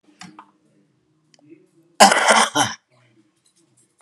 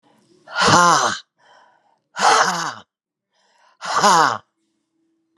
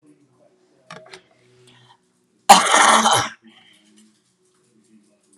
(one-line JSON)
{"three_cough_length": "4.0 s", "three_cough_amplitude": 32768, "three_cough_signal_mean_std_ratio": 0.3, "exhalation_length": "5.4 s", "exhalation_amplitude": 32764, "exhalation_signal_mean_std_ratio": 0.43, "cough_length": "5.4 s", "cough_amplitude": 32768, "cough_signal_mean_std_ratio": 0.29, "survey_phase": "alpha (2021-03-01 to 2021-08-12)", "age": "65+", "gender": "Female", "wearing_mask": "No", "symptom_fatigue": true, "symptom_fever_high_temperature": true, "symptom_headache": true, "symptom_change_to_sense_of_smell_or_taste": true, "symptom_loss_of_taste": true, "symptom_onset": "2 days", "smoker_status": "Ex-smoker", "respiratory_condition_asthma": true, "respiratory_condition_other": false, "recruitment_source": "Test and Trace", "submission_delay": "2 days", "covid_test_result": "Positive", "covid_test_method": "RT-qPCR", "covid_ct_value": 12.0, "covid_ct_gene": "ORF1ab gene", "covid_ct_mean": 12.5, "covid_viral_load": "81000000 copies/ml", "covid_viral_load_category": "High viral load (>1M copies/ml)"}